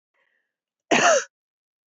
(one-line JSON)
{"cough_length": "1.9 s", "cough_amplitude": 18636, "cough_signal_mean_std_ratio": 0.33, "survey_phase": "beta (2021-08-13 to 2022-03-07)", "age": "45-64", "gender": "Female", "wearing_mask": "No", "symptom_cough_any": true, "symptom_runny_or_blocked_nose": true, "symptom_sore_throat": true, "symptom_fatigue": true, "symptom_fever_high_temperature": true, "symptom_other": true, "symptom_onset": "4 days", "smoker_status": "Never smoked", "respiratory_condition_asthma": false, "respiratory_condition_other": false, "recruitment_source": "Test and Trace", "submission_delay": "2 days", "covid_test_result": "Positive", "covid_test_method": "RT-qPCR", "covid_ct_value": 16.9, "covid_ct_gene": "ORF1ab gene", "covid_ct_mean": 17.4, "covid_viral_load": "1900000 copies/ml", "covid_viral_load_category": "High viral load (>1M copies/ml)"}